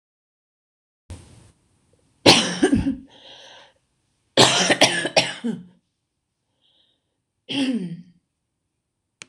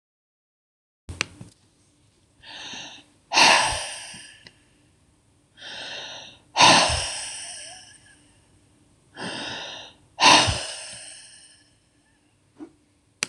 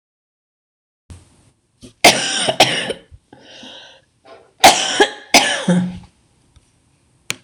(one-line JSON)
{"cough_length": "9.3 s", "cough_amplitude": 26028, "cough_signal_mean_std_ratio": 0.34, "exhalation_length": "13.3 s", "exhalation_amplitude": 26028, "exhalation_signal_mean_std_ratio": 0.32, "three_cough_length": "7.4 s", "three_cough_amplitude": 26028, "three_cough_signal_mean_std_ratio": 0.36, "survey_phase": "beta (2021-08-13 to 2022-03-07)", "age": "65+", "gender": "Female", "wearing_mask": "No", "symptom_cough_any": true, "smoker_status": "Never smoked", "respiratory_condition_asthma": false, "respiratory_condition_other": true, "recruitment_source": "REACT", "submission_delay": "2 days", "covid_test_result": "Negative", "covid_test_method": "RT-qPCR", "influenza_a_test_result": "Negative", "influenza_b_test_result": "Negative"}